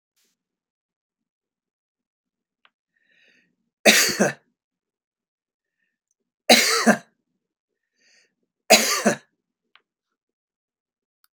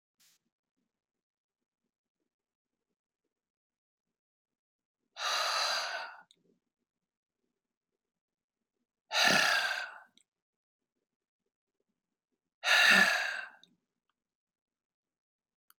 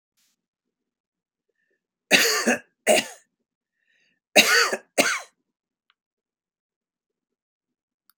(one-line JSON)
{"three_cough_length": "11.3 s", "three_cough_amplitude": 32768, "three_cough_signal_mean_std_ratio": 0.24, "exhalation_length": "15.8 s", "exhalation_amplitude": 8718, "exhalation_signal_mean_std_ratio": 0.28, "cough_length": "8.2 s", "cough_amplitude": 29056, "cough_signal_mean_std_ratio": 0.29, "survey_phase": "beta (2021-08-13 to 2022-03-07)", "age": "65+", "gender": "Male", "wearing_mask": "No", "symptom_none": true, "smoker_status": "Never smoked", "respiratory_condition_asthma": false, "respiratory_condition_other": false, "recruitment_source": "REACT", "submission_delay": "3 days", "covid_test_result": "Negative", "covid_test_method": "RT-qPCR"}